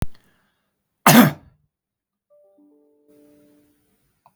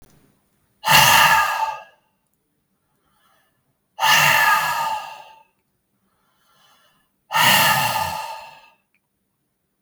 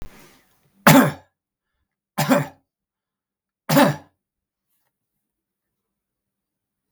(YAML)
cough_length: 4.4 s
cough_amplitude: 32768
cough_signal_mean_std_ratio: 0.22
exhalation_length: 9.8 s
exhalation_amplitude: 32766
exhalation_signal_mean_std_ratio: 0.44
three_cough_length: 6.9 s
three_cough_amplitude: 32768
three_cough_signal_mean_std_ratio: 0.25
survey_phase: beta (2021-08-13 to 2022-03-07)
age: 45-64
gender: Male
wearing_mask: 'No'
symptom_sore_throat: true
symptom_onset: 11 days
smoker_status: Never smoked
respiratory_condition_asthma: false
respiratory_condition_other: true
recruitment_source: REACT
submission_delay: 1 day
covid_test_result: Positive
covid_test_method: RT-qPCR
covid_ct_value: 24.0
covid_ct_gene: N gene
influenza_a_test_result: Negative
influenza_b_test_result: Negative